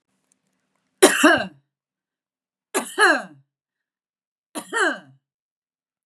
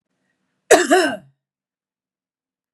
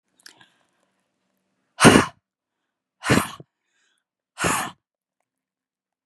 {
  "three_cough_length": "6.1 s",
  "three_cough_amplitude": 32051,
  "three_cough_signal_mean_std_ratio": 0.3,
  "cough_length": "2.7 s",
  "cough_amplitude": 32768,
  "cough_signal_mean_std_ratio": 0.29,
  "exhalation_length": "6.1 s",
  "exhalation_amplitude": 32768,
  "exhalation_signal_mean_std_ratio": 0.23,
  "survey_phase": "beta (2021-08-13 to 2022-03-07)",
  "age": "45-64",
  "gender": "Female",
  "wearing_mask": "No",
  "symptom_none": true,
  "smoker_status": "Ex-smoker",
  "respiratory_condition_asthma": false,
  "respiratory_condition_other": false,
  "recruitment_source": "REACT",
  "submission_delay": "1 day",
  "covid_test_result": "Negative",
  "covid_test_method": "RT-qPCR",
  "influenza_a_test_result": "Negative",
  "influenza_b_test_result": "Negative"
}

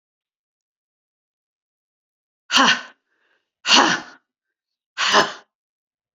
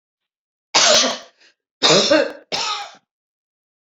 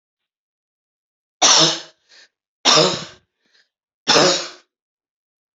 {
  "exhalation_length": "6.1 s",
  "exhalation_amplitude": 32768,
  "exhalation_signal_mean_std_ratio": 0.29,
  "cough_length": "3.8 s",
  "cough_amplitude": 29508,
  "cough_signal_mean_std_ratio": 0.44,
  "three_cough_length": "5.5 s",
  "three_cough_amplitude": 32768,
  "three_cough_signal_mean_std_ratio": 0.35,
  "survey_phase": "alpha (2021-03-01 to 2021-08-12)",
  "age": "45-64",
  "gender": "Female",
  "wearing_mask": "No",
  "symptom_none": true,
  "smoker_status": "Never smoked",
  "respiratory_condition_asthma": false,
  "respiratory_condition_other": false,
  "recruitment_source": "REACT",
  "submission_delay": "1 day",
  "covid_test_result": "Negative",
  "covid_test_method": "RT-qPCR"
}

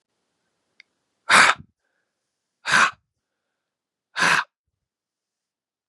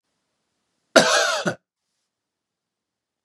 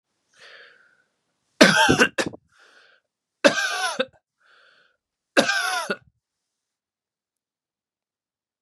{
  "exhalation_length": "5.9 s",
  "exhalation_amplitude": 30893,
  "exhalation_signal_mean_std_ratio": 0.27,
  "cough_length": "3.2 s",
  "cough_amplitude": 32767,
  "cough_signal_mean_std_ratio": 0.29,
  "three_cough_length": "8.6 s",
  "three_cough_amplitude": 32751,
  "three_cough_signal_mean_std_ratio": 0.3,
  "survey_phase": "beta (2021-08-13 to 2022-03-07)",
  "age": "18-44",
  "gender": "Male",
  "wearing_mask": "No",
  "symptom_cough_any": true,
  "symptom_new_continuous_cough": true,
  "symptom_runny_or_blocked_nose": true,
  "symptom_sore_throat": true,
  "symptom_fatigue": true,
  "symptom_headache": true,
  "symptom_change_to_sense_of_smell_or_taste": true,
  "symptom_onset": "3 days",
  "smoker_status": "Never smoked",
  "respiratory_condition_asthma": false,
  "respiratory_condition_other": false,
  "recruitment_source": "Test and Trace",
  "submission_delay": "1 day",
  "covid_test_result": "Positive",
  "covid_test_method": "RT-qPCR",
  "covid_ct_value": 27.2,
  "covid_ct_gene": "N gene"
}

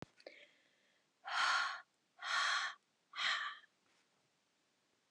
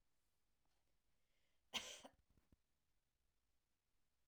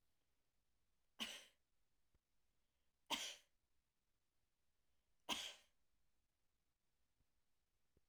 {
  "exhalation_length": "5.1 s",
  "exhalation_amplitude": 2422,
  "exhalation_signal_mean_std_ratio": 0.45,
  "cough_length": "4.3 s",
  "cough_amplitude": 849,
  "cough_signal_mean_std_ratio": 0.24,
  "three_cough_length": "8.1 s",
  "three_cough_amplitude": 1021,
  "three_cough_signal_mean_std_ratio": 0.26,
  "survey_phase": "alpha (2021-03-01 to 2021-08-12)",
  "age": "65+",
  "gender": "Female",
  "wearing_mask": "No",
  "symptom_none": true,
  "smoker_status": "Ex-smoker",
  "respiratory_condition_asthma": false,
  "respiratory_condition_other": false,
  "recruitment_source": "REACT",
  "submission_delay": "31 days",
  "covid_test_result": "Negative",
  "covid_test_method": "RT-qPCR"
}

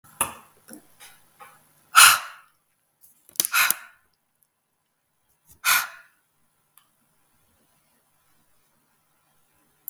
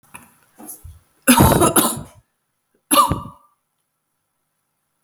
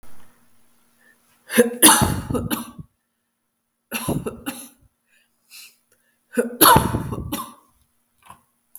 {
  "exhalation_length": "9.9 s",
  "exhalation_amplitude": 32768,
  "exhalation_signal_mean_std_ratio": 0.2,
  "cough_length": "5.0 s",
  "cough_amplitude": 32768,
  "cough_signal_mean_std_ratio": 0.35,
  "three_cough_length": "8.8 s",
  "three_cough_amplitude": 32768,
  "three_cough_signal_mean_std_ratio": 0.34,
  "survey_phase": "beta (2021-08-13 to 2022-03-07)",
  "age": "45-64",
  "gender": "Female",
  "wearing_mask": "No",
  "symptom_cough_any": true,
  "symptom_runny_or_blocked_nose": true,
  "symptom_fatigue": true,
  "symptom_change_to_sense_of_smell_or_taste": true,
  "smoker_status": "Never smoked",
  "respiratory_condition_asthma": false,
  "respiratory_condition_other": false,
  "recruitment_source": "Test and Trace",
  "submission_delay": "2 days",
  "covid_test_result": "Positive",
  "covid_test_method": "RT-qPCR",
  "covid_ct_value": 25.8,
  "covid_ct_gene": "ORF1ab gene",
  "covid_ct_mean": 26.7,
  "covid_viral_load": "1800 copies/ml",
  "covid_viral_load_category": "Minimal viral load (< 10K copies/ml)"
}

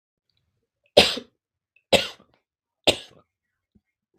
{
  "three_cough_length": "4.2 s",
  "three_cough_amplitude": 32766,
  "three_cough_signal_mean_std_ratio": 0.21,
  "survey_phase": "beta (2021-08-13 to 2022-03-07)",
  "age": "18-44",
  "gender": "Male",
  "wearing_mask": "No",
  "symptom_none": true,
  "smoker_status": "Never smoked",
  "respiratory_condition_asthma": false,
  "respiratory_condition_other": false,
  "recruitment_source": "Test and Trace",
  "submission_delay": "1 day",
  "covid_test_result": "Positive",
  "covid_test_method": "RT-qPCR",
  "covid_ct_value": 18.1,
  "covid_ct_gene": "ORF1ab gene",
  "covid_ct_mean": 18.5,
  "covid_viral_load": "830000 copies/ml",
  "covid_viral_load_category": "Low viral load (10K-1M copies/ml)"
}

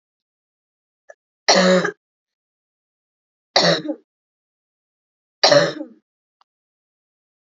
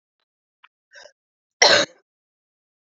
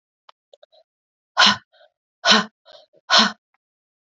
{
  "three_cough_length": "7.6 s",
  "three_cough_amplitude": 32767,
  "three_cough_signal_mean_std_ratio": 0.29,
  "cough_length": "3.0 s",
  "cough_amplitude": 32768,
  "cough_signal_mean_std_ratio": 0.22,
  "exhalation_length": "4.1 s",
  "exhalation_amplitude": 31274,
  "exhalation_signal_mean_std_ratio": 0.29,
  "survey_phase": "beta (2021-08-13 to 2022-03-07)",
  "age": "45-64",
  "gender": "Female",
  "wearing_mask": "No",
  "symptom_cough_any": true,
  "symptom_new_continuous_cough": true,
  "symptom_runny_or_blocked_nose": true,
  "symptom_sore_throat": true,
  "symptom_fatigue": true,
  "symptom_change_to_sense_of_smell_or_taste": true,
  "symptom_loss_of_taste": true,
  "symptom_other": true,
  "symptom_onset": "4 days",
  "smoker_status": "Never smoked",
  "respiratory_condition_asthma": false,
  "respiratory_condition_other": false,
  "recruitment_source": "Test and Trace",
  "submission_delay": "1 day",
  "covid_test_result": "Positive",
  "covid_test_method": "RT-qPCR",
  "covid_ct_value": 24.8,
  "covid_ct_gene": "ORF1ab gene"
}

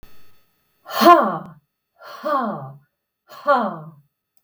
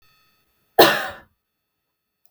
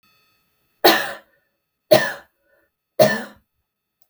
{
  "exhalation_length": "4.4 s",
  "exhalation_amplitude": 32768,
  "exhalation_signal_mean_std_ratio": 0.36,
  "cough_length": "2.3 s",
  "cough_amplitude": 32768,
  "cough_signal_mean_std_ratio": 0.24,
  "three_cough_length": "4.1 s",
  "three_cough_amplitude": 32766,
  "three_cough_signal_mean_std_ratio": 0.29,
  "survey_phase": "beta (2021-08-13 to 2022-03-07)",
  "age": "45-64",
  "gender": "Female",
  "wearing_mask": "No",
  "symptom_none": true,
  "symptom_onset": "12 days",
  "smoker_status": "Ex-smoker",
  "respiratory_condition_asthma": false,
  "respiratory_condition_other": false,
  "recruitment_source": "REACT",
  "submission_delay": "3 days",
  "covid_test_result": "Negative",
  "covid_test_method": "RT-qPCR"
}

